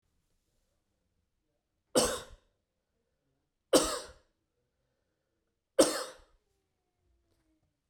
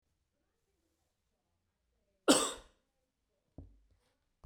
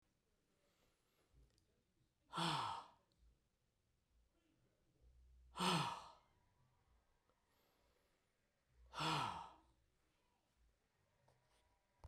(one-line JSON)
{"three_cough_length": "7.9 s", "three_cough_amplitude": 11622, "three_cough_signal_mean_std_ratio": 0.21, "cough_length": "4.5 s", "cough_amplitude": 10260, "cough_signal_mean_std_ratio": 0.18, "exhalation_length": "12.1 s", "exhalation_amplitude": 1608, "exhalation_signal_mean_std_ratio": 0.3, "survey_phase": "beta (2021-08-13 to 2022-03-07)", "age": "45-64", "gender": "Male", "wearing_mask": "No", "symptom_runny_or_blocked_nose": true, "symptom_onset": "13 days", "smoker_status": "Never smoked", "respiratory_condition_asthma": false, "respiratory_condition_other": false, "recruitment_source": "REACT", "submission_delay": "6 days", "covid_test_result": "Negative", "covid_test_method": "RT-qPCR"}